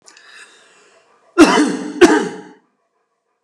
{"cough_length": "3.4 s", "cough_amplitude": 32768, "cough_signal_mean_std_ratio": 0.36, "survey_phase": "alpha (2021-03-01 to 2021-08-12)", "age": "45-64", "gender": "Male", "wearing_mask": "No", "symptom_none": true, "smoker_status": "Never smoked", "respiratory_condition_asthma": false, "respiratory_condition_other": false, "recruitment_source": "REACT", "submission_delay": "1 day", "covid_test_result": "Negative", "covid_test_method": "RT-qPCR"}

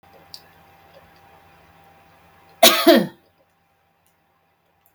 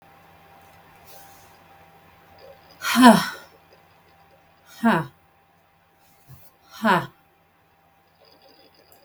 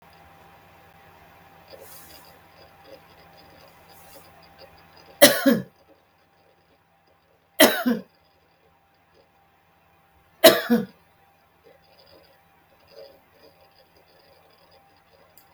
{"cough_length": "4.9 s", "cough_amplitude": 32768, "cough_signal_mean_std_ratio": 0.23, "exhalation_length": "9.0 s", "exhalation_amplitude": 32766, "exhalation_signal_mean_std_ratio": 0.25, "three_cough_length": "15.5 s", "three_cough_amplitude": 32768, "three_cough_signal_mean_std_ratio": 0.21, "survey_phase": "beta (2021-08-13 to 2022-03-07)", "age": "65+", "gender": "Female", "wearing_mask": "No", "symptom_none": true, "smoker_status": "Never smoked", "respiratory_condition_asthma": false, "respiratory_condition_other": false, "recruitment_source": "REACT", "submission_delay": "1 day", "covid_test_result": "Negative", "covid_test_method": "RT-qPCR", "influenza_a_test_result": "Negative", "influenza_b_test_result": "Negative"}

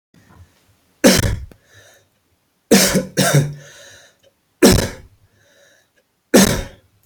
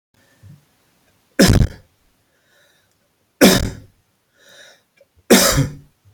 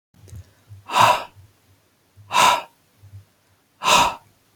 {"cough_length": "7.1 s", "cough_amplitude": 32768, "cough_signal_mean_std_ratio": 0.37, "three_cough_length": "6.1 s", "three_cough_amplitude": 32768, "three_cough_signal_mean_std_ratio": 0.31, "exhalation_length": "4.6 s", "exhalation_amplitude": 27354, "exhalation_signal_mean_std_ratio": 0.37, "survey_phase": "alpha (2021-03-01 to 2021-08-12)", "age": "18-44", "gender": "Male", "wearing_mask": "No", "symptom_none": true, "smoker_status": "Ex-smoker", "respiratory_condition_asthma": false, "respiratory_condition_other": false, "recruitment_source": "REACT", "submission_delay": "1 day", "covid_test_result": "Negative", "covid_test_method": "RT-qPCR"}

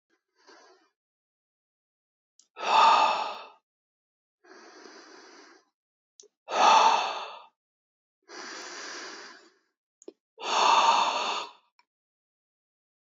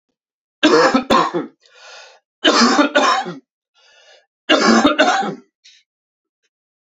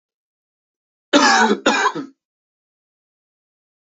{"exhalation_length": "13.1 s", "exhalation_amplitude": 13143, "exhalation_signal_mean_std_ratio": 0.35, "three_cough_length": "6.9 s", "three_cough_amplitude": 32768, "three_cough_signal_mean_std_ratio": 0.49, "cough_length": "3.8 s", "cough_amplitude": 28439, "cough_signal_mean_std_ratio": 0.36, "survey_phase": "alpha (2021-03-01 to 2021-08-12)", "age": "18-44", "gender": "Male", "wearing_mask": "No", "symptom_none": true, "symptom_onset": "12 days", "smoker_status": "Never smoked", "respiratory_condition_asthma": false, "respiratory_condition_other": false, "recruitment_source": "REACT", "submission_delay": "1 day", "covid_test_result": "Negative", "covid_test_method": "RT-qPCR"}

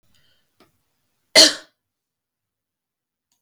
{"cough_length": "3.4 s", "cough_amplitude": 32768, "cough_signal_mean_std_ratio": 0.17, "survey_phase": "beta (2021-08-13 to 2022-03-07)", "age": "18-44", "gender": "Male", "wearing_mask": "No", "symptom_runny_or_blocked_nose": true, "symptom_onset": "71 days", "smoker_status": "Never smoked", "respiratory_condition_asthma": false, "respiratory_condition_other": false, "recruitment_source": "Test and Trace", "submission_delay": "68 days", "covid_test_method": "RT-qPCR"}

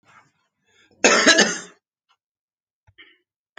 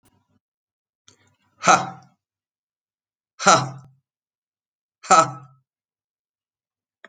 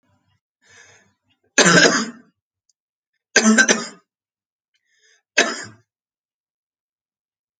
{"cough_length": "3.6 s", "cough_amplitude": 29392, "cough_signal_mean_std_ratio": 0.29, "exhalation_length": "7.1 s", "exhalation_amplitude": 29504, "exhalation_signal_mean_std_ratio": 0.22, "three_cough_length": "7.6 s", "three_cough_amplitude": 32768, "three_cough_signal_mean_std_ratio": 0.29, "survey_phase": "beta (2021-08-13 to 2022-03-07)", "age": "45-64", "gender": "Male", "wearing_mask": "No", "symptom_cough_any": true, "symptom_new_continuous_cough": true, "symptom_runny_or_blocked_nose": true, "symptom_sore_throat": true, "symptom_fatigue": true, "symptom_fever_high_temperature": true, "symptom_headache": true, "symptom_change_to_sense_of_smell_or_taste": true, "symptom_onset": "3 days", "smoker_status": "Never smoked", "respiratory_condition_asthma": false, "respiratory_condition_other": false, "recruitment_source": "Test and Trace", "submission_delay": "2 days", "covid_test_result": "Positive", "covid_test_method": "RT-qPCR", "covid_ct_value": 24.5, "covid_ct_gene": "ORF1ab gene"}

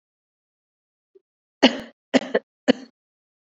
{"three_cough_length": "3.6 s", "three_cough_amplitude": 27315, "three_cough_signal_mean_std_ratio": 0.2, "survey_phase": "beta (2021-08-13 to 2022-03-07)", "age": "18-44", "gender": "Female", "wearing_mask": "No", "symptom_runny_or_blocked_nose": true, "symptom_shortness_of_breath": true, "symptom_headache": true, "symptom_onset": "3 days", "smoker_status": "Never smoked", "respiratory_condition_asthma": false, "respiratory_condition_other": false, "recruitment_source": "Test and Trace", "submission_delay": "1 day", "covid_test_result": "Positive", "covid_test_method": "RT-qPCR", "covid_ct_value": 29.4, "covid_ct_gene": "ORF1ab gene"}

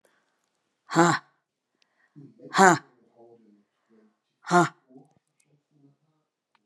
{"exhalation_length": "6.7 s", "exhalation_amplitude": 28737, "exhalation_signal_mean_std_ratio": 0.23, "survey_phase": "beta (2021-08-13 to 2022-03-07)", "age": "65+", "gender": "Female", "wearing_mask": "No", "symptom_cough_any": true, "symptom_runny_or_blocked_nose": true, "symptom_fatigue": true, "symptom_fever_high_temperature": true, "symptom_headache": true, "symptom_change_to_sense_of_smell_or_taste": true, "symptom_onset": "3 days", "smoker_status": "Never smoked", "respiratory_condition_asthma": false, "respiratory_condition_other": false, "recruitment_source": "Test and Trace", "submission_delay": "1 day", "covid_test_result": "Positive", "covid_test_method": "LAMP"}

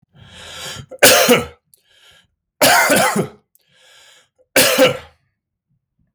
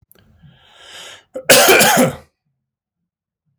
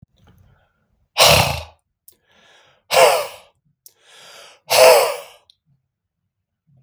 {"three_cough_length": "6.1 s", "three_cough_amplitude": 32768, "three_cough_signal_mean_std_ratio": 0.43, "cough_length": "3.6 s", "cough_amplitude": 32768, "cough_signal_mean_std_ratio": 0.38, "exhalation_length": "6.8 s", "exhalation_amplitude": 32768, "exhalation_signal_mean_std_ratio": 0.33, "survey_phase": "beta (2021-08-13 to 2022-03-07)", "age": "45-64", "gender": "Male", "wearing_mask": "No", "symptom_sore_throat": true, "smoker_status": "Never smoked", "respiratory_condition_asthma": false, "respiratory_condition_other": false, "recruitment_source": "Test and Trace", "submission_delay": "-1 day", "covid_test_result": "Negative", "covid_test_method": "LFT"}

